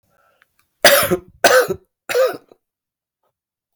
{"three_cough_length": "3.8 s", "three_cough_amplitude": 32768, "three_cough_signal_mean_std_ratio": 0.37, "survey_phase": "alpha (2021-03-01 to 2021-08-12)", "age": "45-64", "gender": "Male", "wearing_mask": "No", "symptom_cough_any": true, "symptom_fatigue": true, "symptom_fever_high_temperature": true, "symptom_change_to_sense_of_smell_or_taste": true, "symptom_loss_of_taste": true, "symptom_onset": "9 days", "smoker_status": "Never smoked", "respiratory_condition_asthma": false, "respiratory_condition_other": false, "recruitment_source": "Test and Trace", "submission_delay": "1 day", "covid_test_result": "Positive", "covid_test_method": "RT-qPCR"}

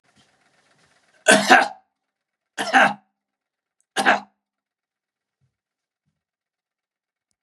{"three_cough_length": "7.4 s", "three_cough_amplitude": 32767, "three_cough_signal_mean_std_ratio": 0.25, "survey_phase": "beta (2021-08-13 to 2022-03-07)", "age": "65+", "gender": "Male", "wearing_mask": "No", "symptom_cough_any": true, "symptom_runny_or_blocked_nose": true, "symptom_sore_throat": true, "symptom_onset": "3 days", "smoker_status": "Never smoked", "respiratory_condition_asthma": false, "respiratory_condition_other": false, "recruitment_source": "REACT", "submission_delay": "2 days", "covid_test_result": "Positive", "covid_test_method": "RT-qPCR", "covid_ct_value": 15.0, "covid_ct_gene": "E gene", "influenza_a_test_result": "Negative", "influenza_b_test_result": "Negative"}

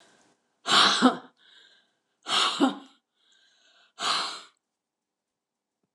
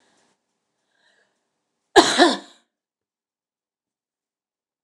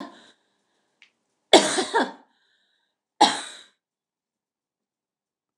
{"exhalation_length": "5.9 s", "exhalation_amplitude": 19225, "exhalation_signal_mean_std_ratio": 0.35, "cough_length": "4.8 s", "cough_amplitude": 29204, "cough_signal_mean_std_ratio": 0.2, "three_cough_length": "5.6 s", "three_cough_amplitude": 29204, "three_cough_signal_mean_std_ratio": 0.23, "survey_phase": "beta (2021-08-13 to 2022-03-07)", "age": "65+", "gender": "Female", "wearing_mask": "No", "symptom_runny_or_blocked_nose": true, "symptom_abdominal_pain": true, "smoker_status": "Never smoked", "respiratory_condition_asthma": true, "respiratory_condition_other": false, "recruitment_source": "REACT", "submission_delay": "2 days", "covid_test_result": "Negative", "covid_test_method": "RT-qPCR", "influenza_a_test_result": "Negative", "influenza_b_test_result": "Negative"}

